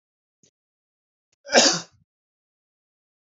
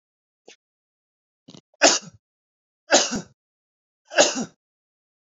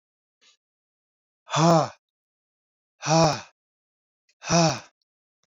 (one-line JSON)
{"cough_length": "3.3 s", "cough_amplitude": 26420, "cough_signal_mean_std_ratio": 0.21, "three_cough_length": "5.2 s", "three_cough_amplitude": 29471, "three_cough_signal_mean_std_ratio": 0.26, "exhalation_length": "5.5 s", "exhalation_amplitude": 15179, "exhalation_signal_mean_std_ratio": 0.32, "survey_phase": "beta (2021-08-13 to 2022-03-07)", "age": "18-44", "gender": "Male", "wearing_mask": "No", "symptom_none": true, "smoker_status": "Never smoked", "respiratory_condition_asthma": false, "respiratory_condition_other": false, "recruitment_source": "REACT", "submission_delay": "1 day", "covid_test_result": "Negative", "covid_test_method": "RT-qPCR", "influenza_a_test_result": "Negative", "influenza_b_test_result": "Negative"}